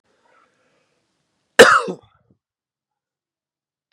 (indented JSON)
{
  "cough_length": "3.9 s",
  "cough_amplitude": 32768,
  "cough_signal_mean_std_ratio": 0.19,
  "survey_phase": "beta (2021-08-13 to 2022-03-07)",
  "age": "18-44",
  "gender": "Male",
  "wearing_mask": "No",
  "symptom_cough_any": true,
  "symptom_abdominal_pain": true,
  "symptom_fatigue": true,
  "symptom_headache": true,
  "symptom_change_to_sense_of_smell_or_taste": true,
  "symptom_loss_of_taste": true,
  "smoker_status": "Never smoked",
  "respiratory_condition_asthma": false,
  "respiratory_condition_other": false,
  "recruitment_source": "Test and Trace",
  "submission_delay": "1 day",
  "covid_test_result": "Positive",
  "covid_test_method": "RT-qPCR",
  "covid_ct_value": 35.4,
  "covid_ct_gene": "ORF1ab gene"
}